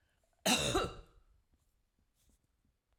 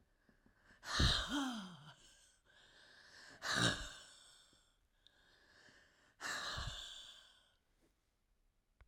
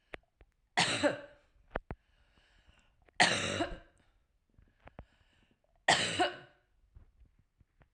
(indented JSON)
{
  "cough_length": "3.0 s",
  "cough_amplitude": 4809,
  "cough_signal_mean_std_ratio": 0.32,
  "exhalation_length": "8.9 s",
  "exhalation_amplitude": 2862,
  "exhalation_signal_mean_std_ratio": 0.39,
  "three_cough_length": "7.9 s",
  "three_cough_amplitude": 11638,
  "three_cough_signal_mean_std_ratio": 0.32,
  "survey_phase": "beta (2021-08-13 to 2022-03-07)",
  "age": "45-64",
  "gender": "Female",
  "wearing_mask": "No",
  "symptom_none": true,
  "smoker_status": "Ex-smoker",
  "respiratory_condition_asthma": false,
  "respiratory_condition_other": false,
  "recruitment_source": "REACT",
  "submission_delay": "3 days",
  "covid_test_result": "Negative",
  "covid_test_method": "RT-qPCR",
  "influenza_a_test_result": "Negative",
  "influenza_b_test_result": "Negative"
}